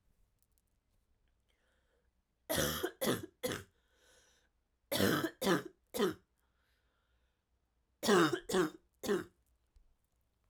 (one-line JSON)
{"three_cough_length": "10.5 s", "three_cough_amplitude": 5340, "three_cough_signal_mean_std_ratio": 0.36, "survey_phase": "alpha (2021-03-01 to 2021-08-12)", "age": "18-44", "gender": "Female", "wearing_mask": "No", "symptom_cough_any": true, "symptom_headache": true, "symptom_onset": "3 days", "smoker_status": "Never smoked", "respiratory_condition_asthma": false, "respiratory_condition_other": false, "recruitment_source": "Test and Trace", "submission_delay": "2 days", "covid_test_result": "Positive", "covid_test_method": "RT-qPCR", "covid_ct_value": 19.2, "covid_ct_gene": "ORF1ab gene"}